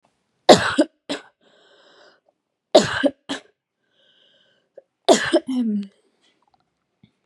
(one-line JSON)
{"three_cough_length": "7.3 s", "three_cough_amplitude": 32768, "three_cough_signal_mean_std_ratio": 0.29, "survey_phase": "beta (2021-08-13 to 2022-03-07)", "age": "18-44", "gender": "Female", "wearing_mask": "No", "symptom_none": true, "symptom_onset": "3 days", "smoker_status": "Current smoker (1 to 10 cigarettes per day)", "respiratory_condition_asthma": false, "respiratory_condition_other": false, "recruitment_source": "REACT", "submission_delay": "1 day", "covid_test_result": "Negative", "covid_test_method": "RT-qPCR", "influenza_a_test_result": "Negative", "influenza_b_test_result": "Negative"}